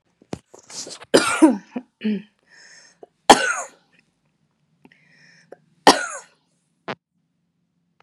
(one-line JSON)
{"three_cough_length": "8.0 s", "three_cough_amplitude": 32768, "three_cough_signal_mean_std_ratio": 0.25, "survey_phase": "beta (2021-08-13 to 2022-03-07)", "age": "18-44", "gender": "Female", "wearing_mask": "No", "symptom_runny_or_blocked_nose": true, "symptom_diarrhoea": true, "symptom_change_to_sense_of_smell_or_taste": true, "smoker_status": "Current smoker (1 to 10 cigarettes per day)", "respiratory_condition_asthma": false, "respiratory_condition_other": false, "recruitment_source": "Test and Trace", "submission_delay": "2 days", "covid_test_result": "Positive", "covid_test_method": "RT-qPCR", "covid_ct_value": 18.6, "covid_ct_gene": "ORF1ab gene"}